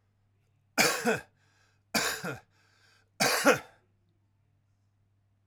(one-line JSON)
{"three_cough_length": "5.5 s", "three_cough_amplitude": 12574, "three_cough_signal_mean_std_ratio": 0.34, "survey_phase": "alpha (2021-03-01 to 2021-08-12)", "age": "45-64", "gender": "Male", "wearing_mask": "No", "symptom_none": true, "smoker_status": "Never smoked", "respiratory_condition_asthma": false, "respiratory_condition_other": false, "recruitment_source": "REACT", "submission_delay": "1 day", "covid_test_result": "Negative", "covid_test_method": "RT-qPCR"}